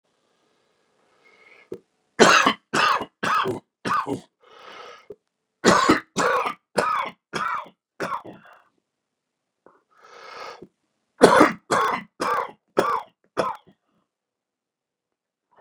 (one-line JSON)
{"three_cough_length": "15.6 s", "three_cough_amplitude": 32768, "three_cough_signal_mean_std_ratio": 0.36, "survey_phase": "beta (2021-08-13 to 2022-03-07)", "age": "65+", "gender": "Male", "wearing_mask": "No", "symptom_cough_any": true, "symptom_new_continuous_cough": true, "symptom_runny_or_blocked_nose": true, "symptom_shortness_of_breath": true, "symptom_sore_throat": true, "symptom_abdominal_pain": true, "symptom_fatigue": true, "symptom_headache": true, "symptom_change_to_sense_of_smell_or_taste": true, "symptom_loss_of_taste": true, "symptom_onset": "3 days", "smoker_status": "Ex-smoker", "respiratory_condition_asthma": false, "respiratory_condition_other": true, "recruitment_source": "Test and Trace", "submission_delay": "2 days", "covid_test_result": "Positive", "covid_test_method": "ePCR"}